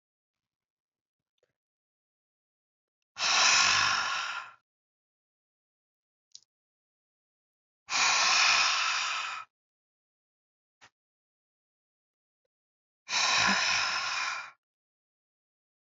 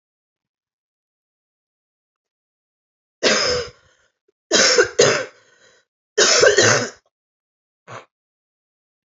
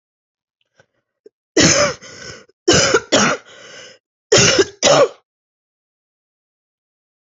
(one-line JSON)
{"exhalation_length": "15.9 s", "exhalation_amplitude": 10907, "exhalation_signal_mean_std_ratio": 0.4, "three_cough_length": "9.0 s", "three_cough_amplitude": 31192, "three_cough_signal_mean_std_ratio": 0.35, "cough_length": "7.3 s", "cough_amplitude": 32390, "cough_signal_mean_std_ratio": 0.39, "survey_phase": "alpha (2021-03-01 to 2021-08-12)", "age": "18-44", "gender": "Female", "wearing_mask": "No", "symptom_cough_any": true, "symptom_fatigue": true, "symptom_headache": true, "symptom_onset": "3 days", "smoker_status": "Never smoked", "respiratory_condition_asthma": false, "respiratory_condition_other": false, "recruitment_source": "Test and Trace", "submission_delay": "2 days", "covid_test_result": "Positive", "covid_test_method": "RT-qPCR", "covid_ct_value": 24.1, "covid_ct_gene": "ORF1ab gene", "covid_ct_mean": 24.8, "covid_viral_load": "7100 copies/ml", "covid_viral_load_category": "Minimal viral load (< 10K copies/ml)"}